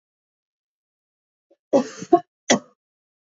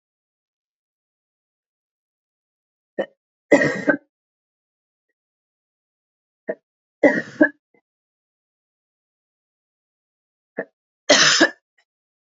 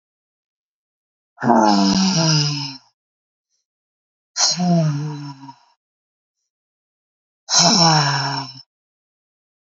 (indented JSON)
{
  "cough_length": "3.2 s",
  "cough_amplitude": 26672,
  "cough_signal_mean_std_ratio": 0.22,
  "three_cough_length": "12.2 s",
  "three_cough_amplitude": 30349,
  "three_cough_signal_mean_std_ratio": 0.22,
  "exhalation_length": "9.6 s",
  "exhalation_amplitude": 29073,
  "exhalation_signal_mean_std_ratio": 0.47,
  "survey_phase": "beta (2021-08-13 to 2022-03-07)",
  "age": "45-64",
  "gender": "Female",
  "wearing_mask": "No",
  "symptom_cough_any": true,
  "symptom_runny_or_blocked_nose": true,
  "symptom_sore_throat": true,
  "symptom_fatigue": true,
  "symptom_headache": true,
  "symptom_change_to_sense_of_smell_or_taste": true,
  "symptom_loss_of_taste": true,
  "symptom_onset": "5 days",
  "smoker_status": "Never smoked",
  "respiratory_condition_asthma": false,
  "respiratory_condition_other": false,
  "recruitment_source": "Test and Trace",
  "submission_delay": "2 days",
  "covid_test_result": "Positive",
  "covid_test_method": "RT-qPCR",
  "covid_ct_value": 27.5,
  "covid_ct_gene": "N gene"
}